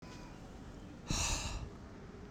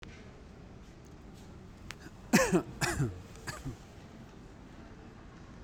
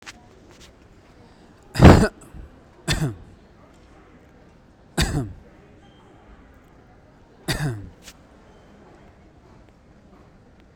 {"exhalation_length": "2.3 s", "exhalation_amplitude": 2478, "exhalation_signal_mean_std_ratio": 0.73, "cough_length": "5.6 s", "cough_amplitude": 8967, "cough_signal_mean_std_ratio": 0.43, "three_cough_length": "10.8 s", "three_cough_amplitude": 32768, "three_cough_signal_mean_std_ratio": 0.23, "survey_phase": "beta (2021-08-13 to 2022-03-07)", "age": "18-44", "gender": "Male", "wearing_mask": "No", "symptom_none": true, "smoker_status": "Never smoked", "respiratory_condition_asthma": false, "respiratory_condition_other": false, "recruitment_source": "REACT", "submission_delay": "3 days", "covid_test_result": "Negative", "covid_test_method": "RT-qPCR"}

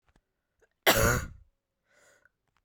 {"cough_length": "2.6 s", "cough_amplitude": 14255, "cough_signal_mean_std_ratio": 0.3, "survey_phase": "beta (2021-08-13 to 2022-03-07)", "age": "18-44", "gender": "Female", "wearing_mask": "No", "symptom_cough_any": true, "symptom_runny_or_blocked_nose": true, "symptom_sore_throat": true, "symptom_fatigue": true, "symptom_fever_high_temperature": true, "symptom_headache": true, "symptom_change_to_sense_of_smell_or_taste": true, "symptom_onset": "2 days", "smoker_status": "Ex-smoker", "respiratory_condition_asthma": false, "respiratory_condition_other": false, "recruitment_source": "Test and Trace", "submission_delay": "2 days", "covid_test_result": "Positive", "covid_test_method": "RT-qPCR", "covid_ct_value": 17.3, "covid_ct_gene": "ORF1ab gene", "covid_ct_mean": 17.7, "covid_viral_load": "1600000 copies/ml", "covid_viral_load_category": "High viral load (>1M copies/ml)"}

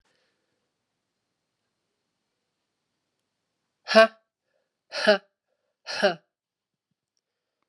{"exhalation_length": "7.7 s", "exhalation_amplitude": 31418, "exhalation_signal_mean_std_ratio": 0.18, "survey_phase": "alpha (2021-03-01 to 2021-08-12)", "age": "18-44", "gender": "Female", "wearing_mask": "No", "symptom_cough_any": true, "symptom_change_to_sense_of_smell_or_taste": true, "symptom_loss_of_taste": true, "smoker_status": "Never smoked", "respiratory_condition_asthma": false, "respiratory_condition_other": false, "recruitment_source": "Test and Trace", "submission_delay": "1 day", "covid_test_result": "Positive", "covid_test_method": "RT-qPCR"}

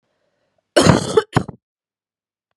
{"cough_length": "2.6 s", "cough_amplitude": 32768, "cough_signal_mean_std_ratio": 0.31, "survey_phase": "beta (2021-08-13 to 2022-03-07)", "age": "18-44", "gender": "Female", "wearing_mask": "No", "symptom_runny_or_blocked_nose": true, "symptom_sore_throat": true, "symptom_fatigue": true, "smoker_status": "Never smoked", "respiratory_condition_asthma": true, "respiratory_condition_other": false, "recruitment_source": "Test and Trace", "submission_delay": "2 days", "covid_test_result": "Positive", "covid_test_method": "RT-qPCR", "covid_ct_value": 22.5, "covid_ct_gene": "ORF1ab gene", "covid_ct_mean": 22.7, "covid_viral_load": "35000 copies/ml", "covid_viral_load_category": "Low viral load (10K-1M copies/ml)"}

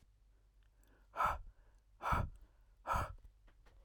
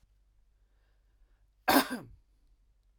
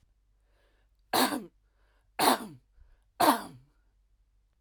{"exhalation_length": "3.8 s", "exhalation_amplitude": 2701, "exhalation_signal_mean_std_ratio": 0.42, "cough_length": "3.0 s", "cough_amplitude": 10441, "cough_signal_mean_std_ratio": 0.23, "three_cough_length": "4.6 s", "three_cough_amplitude": 11335, "three_cough_signal_mean_std_ratio": 0.31, "survey_phase": "alpha (2021-03-01 to 2021-08-12)", "age": "18-44", "gender": "Male", "wearing_mask": "No", "symptom_none": true, "smoker_status": "Never smoked", "respiratory_condition_asthma": false, "respiratory_condition_other": false, "recruitment_source": "REACT", "submission_delay": "2 days", "covid_test_result": "Negative", "covid_test_method": "RT-qPCR"}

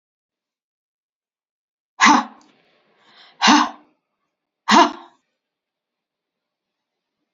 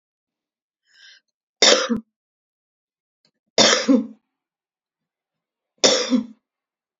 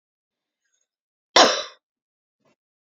{"exhalation_length": "7.3 s", "exhalation_amplitude": 32475, "exhalation_signal_mean_std_ratio": 0.25, "three_cough_length": "7.0 s", "three_cough_amplitude": 32767, "three_cough_signal_mean_std_ratio": 0.31, "cough_length": "3.0 s", "cough_amplitude": 30333, "cough_signal_mean_std_ratio": 0.2, "survey_phase": "beta (2021-08-13 to 2022-03-07)", "age": "45-64", "gender": "Female", "wearing_mask": "No", "symptom_cough_any": true, "symptom_onset": "12 days", "smoker_status": "Ex-smoker", "respiratory_condition_asthma": false, "respiratory_condition_other": false, "recruitment_source": "REACT", "submission_delay": "2 days", "covid_test_result": "Negative", "covid_test_method": "RT-qPCR", "influenza_a_test_result": "Negative", "influenza_b_test_result": "Negative"}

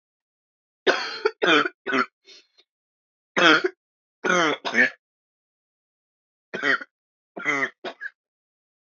{"three_cough_length": "8.9 s", "three_cough_amplitude": 27140, "three_cough_signal_mean_std_ratio": 0.37, "survey_phase": "beta (2021-08-13 to 2022-03-07)", "age": "18-44", "gender": "Female", "wearing_mask": "No", "symptom_cough_any": true, "symptom_new_continuous_cough": true, "symptom_sore_throat": true, "smoker_status": "Never smoked", "respiratory_condition_asthma": false, "respiratory_condition_other": false, "recruitment_source": "Test and Trace", "submission_delay": "2 days", "covid_test_result": "Positive", "covid_test_method": "LFT"}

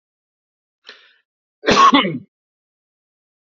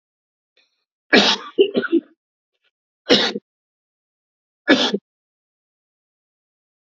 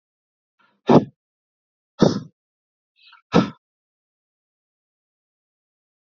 {"cough_length": "3.6 s", "cough_amplitude": 28273, "cough_signal_mean_std_ratio": 0.29, "three_cough_length": "6.9 s", "three_cough_amplitude": 30884, "three_cough_signal_mean_std_ratio": 0.3, "exhalation_length": "6.1 s", "exhalation_amplitude": 27678, "exhalation_signal_mean_std_ratio": 0.19, "survey_phase": "beta (2021-08-13 to 2022-03-07)", "age": "45-64", "gender": "Male", "wearing_mask": "No", "symptom_none": true, "smoker_status": "Never smoked", "respiratory_condition_asthma": false, "respiratory_condition_other": false, "recruitment_source": "REACT", "submission_delay": "1 day", "covid_test_result": "Negative", "covid_test_method": "RT-qPCR"}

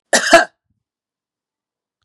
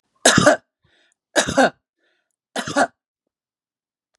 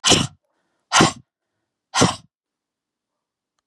{"cough_length": "2.0 s", "cough_amplitude": 32768, "cough_signal_mean_std_ratio": 0.27, "three_cough_length": "4.2 s", "three_cough_amplitude": 32768, "three_cough_signal_mean_std_ratio": 0.32, "exhalation_length": "3.7 s", "exhalation_amplitude": 31695, "exhalation_signal_mean_std_ratio": 0.3, "survey_phase": "beta (2021-08-13 to 2022-03-07)", "age": "65+", "gender": "Female", "wearing_mask": "No", "symptom_none": true, "smoker_status": "Ex-smoker", "respiratory_condition_asthma": false, "respiratory_condition_other": false, "recruitment_source": "Test and Trace", "submission_delay": "0 days", "covid_test_result": "Negative", "covid_test_method": "LFT"}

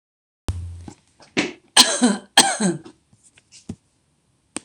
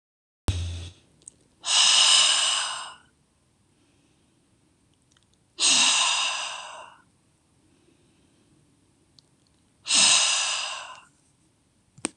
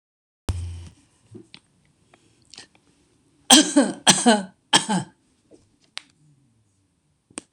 {"cough_length": "4.6 s", "cough_amplitude": 26028, "cough_signal_mean_std_ratio": 0.34, "exhalation_length": "12.2 s", "exhalation_amplitude": 21853, "exhalation_signal_mean_std_ratio": 0.42, "three_cough_length": "7.5 s", "three_cough_amplitude": 26028, "three_cough_signal_mean_std_ratio": 0.28, "survey_phase": "beta (2021-08-13 to 2022-03-07)", "age": "65+", "gender": "Female", "wearing_mask": "No", "symptom_none": true, "smoker_status": "Ex-smoker", "respiratory_condition_asthma": true, "respiratory_condition_other": false, "recruitment_source": "REACT", "submission_delay": "2 days", "covid_test_result": "Negative", "covid_test_method": "RT-qPCR"}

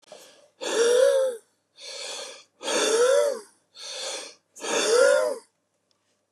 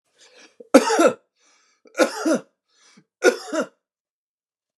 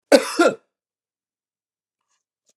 {"exhalation_length": "6.3 s", "exhalation_amplitude": 12732, "exhalation_signal_mean_std_ratio": 0.57, "three_cough_length": "4.8 s", "three_cough_amplitude": 32768, "three_cough_signal_mean_std_ratio": 0.32, "cough_length": "2.6 s", "cough_amplitude": 32503, "cough_signal_mean_std_ratio": 0.25, "survey_phase": "beta (2021-08-13 to 2022-03-07)", "age": "45-64", "gender": "Male", "wearing_mask": "No", "symptom_none": true, "symptom_onset": "12 days", "smoker_status": "Ex-smoker", "respiratory_condition_asthma": false, "respiratory_condition_other": false, "recruitment_source": "REACT", "submission_delay": "2 days", "covid_test_result": "Negative", "covid_test_method": "RT-qPCR", "influenza_a_test_result": "Negative", "influenza_b_test_result": "Negative"}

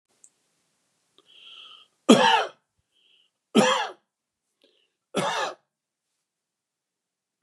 {"three_cough_length": "7.4 s", "three_cough_amplitude": 26175, "three_cough_signal_mean_std_ratio": 0.27, "survey_phase": "beta (2021-08-13 to 2022-03-07)", "age": "45-64", "gender": "Male", "wearing_mask": "No", "symptom_none": true, "smoker_status": "Never smoked", "respiratory_condition_asthma": false, "respiratory_condition_other": false, "recruitment_source": "REACT", "submission_delay": "4 days", "covid_test_result": "Negative", "covid_test_method": "RT-qPCR", "influenza_a_test_result": "Negative", "influenza_b_test_result": "Negative"}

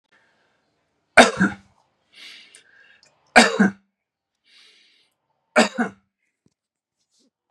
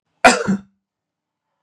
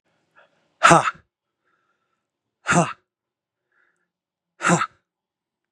{"three_cough_length": "7.5 s", "three_cough_amplitude": 32768, "three_cough_signal_mean_std_ratio": 0.23, "cough_length": "1.6 s", "cough_amplitude": 32768, "cough_signal_mean_std_ratio": 0.3, "exhalation_length": "5.7 s", "exhalation_amplitude": 32767, "exhalation_signal_mean_std_ratio": 0.25, "survey_phase": "beta (2021-08-13 to 2022-03-07)", "age": "45-64", "gender": "Male", "wearing_mask": "No", "symptom_none": true, "symptom_onset": "3 days", "smoker_status": "Never smoked", "respiratory_condition_asthma": false, "respiratory_condition_other": false, "recruitment_source": "Test and Trace", "submission_delay": "2 days", "covid_test_result": "Positive", "covid_test_method": "RT-qPCR", "covid_ct_value": 25.6, "covid_ct_gene": "ORF1ab gene", "covid_ct_mean": 26.0, "covid_viral_load": "3100 copies/ml", "covid_viral_load_category": "Minimal viral load (< 10K copies/ml)"}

